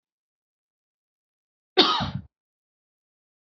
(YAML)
cough_length: 3.6 s
cough_amplitude: 23946
cough_signal_mean_std_ratio: 0.22
survey_phase: alpha (2021-03-01 to 2021-08-12)
age: 18-44
gender: Female
wearing_mask: 'No'
symptom_cough_any: true
symptom_new_continuous_cough: true
symptom_onset: 5 days
smoker_status: Never smoked
respiratory_condition_asthma: true
respiratory_condition_other: false
recruitment_source: Test and Trace
submission_delay: 2 days
covid_test_result: Positive
covid_test_method: RT-qPCR